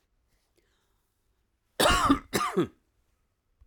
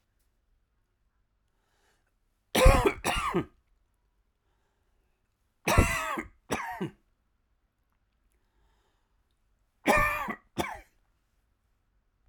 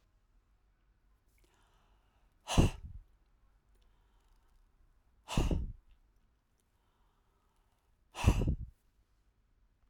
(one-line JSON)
{"cough_length": "3.7 s", "cough_amplitude": 10891, "cough_signal_mean_std_ratio": 0.34, "three_cough_length": "12.3 s", "three_cough_amplitude": 17895, "three_cough_signal_mean_std_ratio": 0.29, "exhalation_length": "9.9 s", "exhalation_amplitude": 7864, "exhalation_signal_mean_std_ratio": 0.25, "survey_phase": "alpha (2021-03-01 to 2021-08-12)", "age": "45-64", "gender": "Male", "wearing_mask": "No", "symptom_cough_any": true, "symptom_fever_high_temperature": true, "smoker_status": "Never smoked", "respiratory_condition_asthma": false, "respiratory_condition_other": false, "recruitment_source": "REACT", "submission_delay": "8 days", "covid_test_result": "Negative", "covid_test_method": "RT-qPCR"}